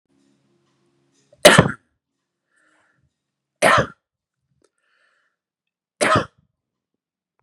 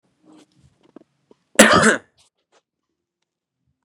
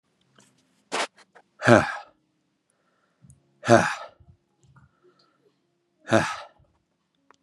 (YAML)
three_cough_length: 7.4 s
three_cough_amplitude: 32768
three_cough_signal_mean_std_ratio: 0.22
cough_length: 3.8 s
cough_amplitude: 32768
cough_signal_mean_std_ratio: 0.24
exhalation_length: 7.4 s
exhalation_amplitude: 32564
exhalation_signal_mean_std_ratio: 0.23
survey_phase: beta (2021-08-13 to 2022-03-07)
age: 18-44
gender: Male
wearing_mask: 'No'
symptom_none: true
symptom_onset: 3 days
smoker_status: Never smoked
respiratory_condition_asthma: false
respiratory_condition_other: false
recruitment_source: REACT
submission_delay: 1 day
covid_test_result: Negative
covid_test_method: RT-qPCR
influenza_a_test_result: Negative
influenza_b_test_result: Negative